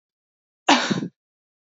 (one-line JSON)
{"cough_length": "1.6 s", "cough_amplitude": 27160, "cough_signal_mean_std_ratio": 0.33, "survey_phase": "beta (2021-08-13 to 2022-03-07)", "age": "18-44", "gender": "Female", "wearing_mask": "No", "symptom_cough_any": true, "symptom_runny_or_blocked_nose": true, "symptom_shortness_of_breath": true, "symptom_sore_throat": true, "symptom_headache": true, "symptom_onset": "2 days", "smoker_status": "Never smoked", "respiratory_condition_asthma": false, "respiratory_condition_other": false, "recruitment_source": "Test and Trace", "submission_delay": "1 day", "covid_test_result": "Positive", "covid_test_method": "RT-qPCR", "covid_ct_value": 28.7, "covid_ct_gene": "N gene", "covid_ct_mean": 28.9, "covid_viral_load": "340 copies/ml", "covid_viral_load_category": "Minimal viral load (< 10K copies/ml)"}